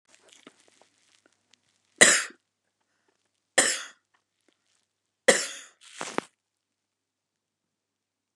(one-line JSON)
{"three_cough_length": "8.4 s", "three_cough_amplitude": 30427, "three_cough_signal_mean_std_ratio": 0.2, "survey_phase": "beta (2021-08-13 to 2022-03-07)", "age": "65+", "gender": "Female", "wearing_mask": "No", "symptom_none": true, "smoker_status": "Never smoked", "respiratory_condition_asthma": false, "respiratory_condition_other": false, "recruitment_source": "REACT", "submission_delay": "1 day", "covid_test_result": "Negative", "covid_test_method": "RT-qPCR", "influenza_a_test_result": "Negative", "influenza_b_test_result": "Negative"}